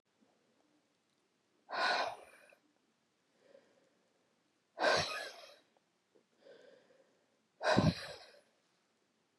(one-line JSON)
{"exhalation_length": "9.4 s", "exhalation_amplitude": 6197, "exhalation_signal_mean_std_ratio": 0.3, "survey_phase": "beta (2021-08-13 to 2022-03-07)", "age": "45-64", "gender": "Female", "wearing_mask": "No", "symptom_none": true, "smoker_status": "Never smoked", "respiratory_condition_asthma": false, "respiratory_condition_other": false, "recruitment_source": "REACT", "submission_delay": "6 days", "covid_test_result": "Negative", "covid_test_method": "RT-qPCR", "influenza_a_test_result": "Negative", "influenza_b_test_result": "Negative"}